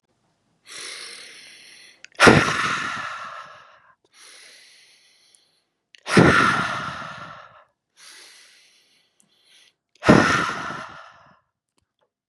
{"exhalation_length": "12.3 s", "exhalation_amplitude": 32768, "exhalation_signal_mean_std_ratio": 0.33, "survey_phase": "beta (2021-08-13 to 2022-03-07)", "age": "18-44", "gender": "Male", "wearing_mask": "No", "symptom_none": true, "smoker_status": "Never smoked", "respiratory_condition_asthma": false, "respiratory_condition_other": false, "recruitment_source": "Test and Trace", "submission_delay": "-1 day", "covid_test_result": "Negative", "covid_test_method": "LFT"}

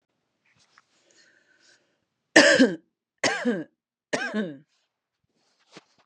{"three_cough_length": "6.1 s", "three_cough_amplitude": 29538, "three_cough_signal_mean_std_ratio": 0.28, "survey_phase": "beta (2021-08-13 to 2022-03-07)", "age": "45-64", "gender": "Female", "wearing_mask": "No", "symptom_none": true, "smoker_status": "Ex-smoker", "respiratory_condition_asthma": false, "respiratory_condition_other": false, "recruitment_source": "REACT", "submission_delay": "2 days", "covid_test_result": "Negative", "covid_test_method": "RT-qPCR", "influenza_a_test_result": "Negative", "influenza_b_test_result": "Negative"}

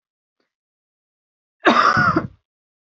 {"cough_length": "2.8 s", "cough_amplitude": 28468, "cough_signal_mean_std_ratio": 0.37, "survey_phase": "beta (2021-08-13 to 2022-03-07)", "age": "18-44", "gender": "Female", "wearing_mask": "No", "symptom_none": true, "smoker_status": "Never smoked", "respiratory_condition_asthma": false, "respiratory_condition_other": false, "recruitment_source": "REACT", "submission_delay": "1 day", "covid_test_result": "Negative", "covid_test_method": "RT-qPCR", "influenza_a_test_result": "Negative", "influenza_b_test_result": "Negative"}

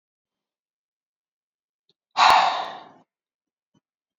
{"exhalation_length": "4.2 s", "exhalation_amplitude": 24728, "exhalation_signal_mean_std_ratio": 0.26, "survey_phase": "beta (2021-08-13 to 2022-03-07)", "age": "18-44", "gender": "Female", "wearing_mask": "No", "symptom_runny_or_blocked_nose": true, "symptom_sore_throat": true, "symptom_fatigue": true, "symptom_headache": true, "symptom_onset": "3 days", "smoker_status": "Never smoked", "respiratory_condition_asthma": false, "respiratory_condition_other": false, "recruitment_source": "Test and Trace", "submission_delay": "1 day", "covid_test_result": "Positive", "covid_test_method": "RT-qPCR", "covid_ct_value": 22.7, "covid_ct_gene": "N gene"}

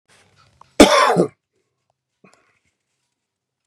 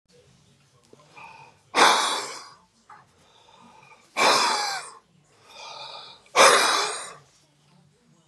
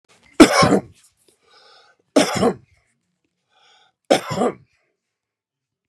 {"cough_length": "3.7 s", "cough_amplitude": 32768, "cough_signal_mean_std_ratio": 0.26, "exhalation_length": "8.3 s", "exhalation_amplitude": 26378, "exhalation_signal_mean_std_ratio": 0.38, "three_cough_length": "5.9 s", "three_cough_amplitude": 32768, "three_cough_signal_mean_std_ratio": 0.3, "survey_phase": "beta (2021-08-13 to 2022-03-07)", "age": "65+", "gender": "Male", "wearing_mask": "No", "symptom_none": true, "smoker_status": "Ex-smoker", "respiratory_condition_asthma": false, "respiratory_condition_other": false, "recruitment_source": "REACT", "submission_delay": "2 days", "covid_test_result": "Negative", "covid_test_method": "RT-qPCR", "influenza_a_test_result": "Negative", "influenza_b_test_result": "Negative"}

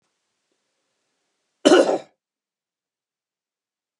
{"cough_length": "4.0 s", "cough_amplitude": 31680, "cough_signal_mean_std_ratio": 0.21, "survey_phase": "beta (2021-08-13 to 2022-03-07)", "age": "65+", "gender": "Male", "wearing_mask": "No", "symptom_none": true, "smoker_status": "Never smoked", "respiratory_condition_asthma": false, "respiratory_condition_other": false, "recruitment_source": "REACT", "submission_delay": "5 days", "covid_test_result": "Negative", "covid_test_method": "RT-qPCR", "influenza_a_test_result": "Negative", "influenza_b_test_result": "Negative"}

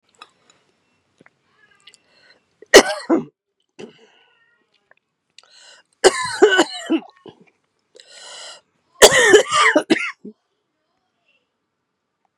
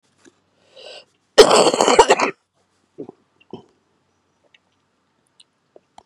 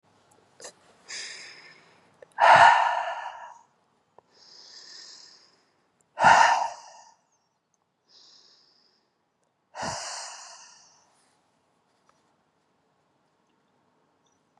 {"three_cough_length": "12.4 s", "three_cough_amplitude": 32768, "three_cough_signal_mean_std_ratio": 0.28, "cough_length": "6.1 s", "cough_amplitude": 32768, "cough_signal_mean_std_ratio": 0.27, "exhalation_length": "14.6 s", "exhalation_amplitude": 23424, "exhalation_signal_mean_std_ratio": 0.26, "survey_phase": "beta (2021-08-13 to 2022-03-07)", "age": "45-64", "gender": "Female", "wearing_mask": "No", "symptom_cough_any": true, "symptom_runny_or_blocked_nose": true, "symptom_fatigue": true, "symptom_headache": true, "symptom_other": true, "symptom_onset": "4 days", "smoker_status": "Never smoked", "respiratory_condition_asthma": false, "respiratory_condition_other": false, "recruitment_source": "Test and Trace", "submission_delay": "1 day", "covid_test_result": "Positive", "covid_test_method": "RT-qPCR", "covid_ct_value": 26.1, "covid_ct_gene": "ORF1ab gene"}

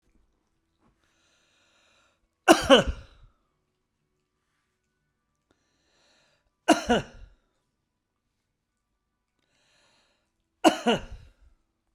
{"three_cough_length": "11.9 s", "three_cough_amplitude": 27614, "three_cough_signal_mean_std_ratio": 0.2, "survey_phase": "beta (2021-08-13 to 2022-03-07)", "age": "45-64", "gender": "Male", "wearing_mask": "No", "symptom_none": true, "smoker_status": "Never smoked", "respiratory_condition_asthma": false, "respiratory_condition_other": false, "recruitment_source": "REACT", "submission_delay": "1 day", "covid_test_result": "Negative", "covid_test_method": "RT-qPCR"}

